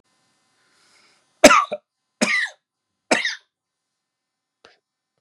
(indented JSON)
{
  "three_cough_length": "5.2 s",
  "three_cough_amplitude": 32768,
  "three_cough_signal_mean_std_ratio": 0.24,
  "survey_phase": "beta (2021-08-13 to 2022-03-07)",
  "age": "65+",
  "gender": "Male",
  "wearing_mask": "No",
  "symptom_none": true,
  "smoker_status": "Ex-smoker",
  "respiratory_condition_asthma": false,
  "respiratory_condition_other": false,
  "recruitment_source": "REACT",
  "submission_delay": "1 day",
  "covid_test_result": "Negative",
  "covid_test_method": "RT-qPCR",
  "influenza_a_test_result": "Negative",
  "influenza_b_test_result": "Negative"
}